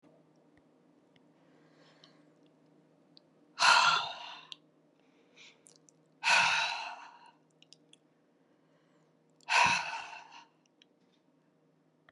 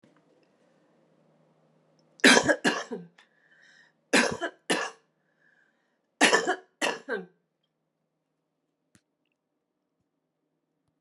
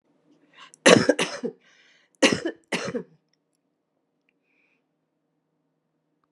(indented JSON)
{
  "exhalation_length": "12.1 s",
  "exhalation_amplitude": 10772,
  "exhalation_signal_mean_std_ratio": 0.3,
  "three_cough_length": "11.0 s",
  "three_cough_amplitude": 22183,
  "three_cough_signal_mean_std_ratio": 0.27,
  "cough_length": "6.3 s",
  "cough_amplitude": 32625,
  "cough_signal_mean_std_ratio": 0.24,
  "survey_phase": "beta (2021-08-13 to 2022-03-07)",
  "age": "65+",
  "gender": "Female",
  "wearing_mask": "No",
  "symptom_none": true,
  "smoker_status": "Current smoker (1 to 10 cigarettes per day)",
  "respiratory_condition_asthma": false,
  "respiratory_condition_other": false,
  "recruitment_source": "REACT",
  "submission_delay": "1 day",
  "covid_test_result": "Negative",
  "covid_test_method": "RT-qPCR"
}